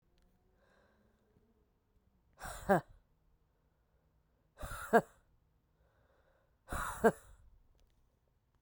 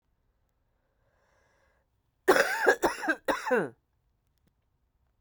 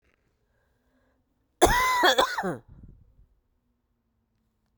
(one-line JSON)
{"exhalation_length": "8.6 s", "exhalation_amplitude": 6597, "exhalation_signal_mean_std_ratio": 0.21, "three_cough_length": "5.2 s", "three_cough_amplitude": 13226, "three_cough_signal_mean_std_ratio": 0.33, "cough_length": "4.8 s", "cough_amplitude": 21957, "cough_signal_mean_std_ratio": 0.33, "survey_phase": "beta (2021-08-13 to 2022-03-07)", "age": "45-64", "gender": "Female", "wearing_mask": "No", "symptom_cough_any": true, "symptom_runny_or_blocked_nose": true, "symptom_shortness_of_breath": true, "symptom_abdominal_pain": true, "symptom_headache": true, "symptom_change_to_sense_of_smell_or_taste": true, "symptom_loss_of_taste": true, "symptom_onset": "3 days", "smoker_status": "Never smoked", "respiratory_condition_asthma": false, "respiratory_condition_other": false, "recruitment_source": "Test and Trace", "submission_delay": "2 days", "covid_test_result": "Positive", "covid_test_method": "RT-qPCR", "covid_ct_value": 27.0, "covid_ct_gene": "ORF1ab gene"}